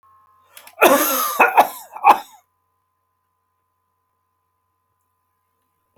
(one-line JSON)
{"cough_length": "6.0 s", "cough_amplitude": 32768, "cough_signal_mean_std_ratio": 0.3, "survey_phase": "alpha (2021-03-01 to 2021-08-12)", "age": "65+", "gender": "Male", "wearing_mask": "No", "symptom_none": true, "smoker_status": "Never smoked", "respiratory_condition_asthma": false, "respiratory_condition_other": false, "recruitment_source": "REACT", "submission_delay": "2 days", "covid_test_result": "Negative", "covid_test_method": "RT-qPCR"}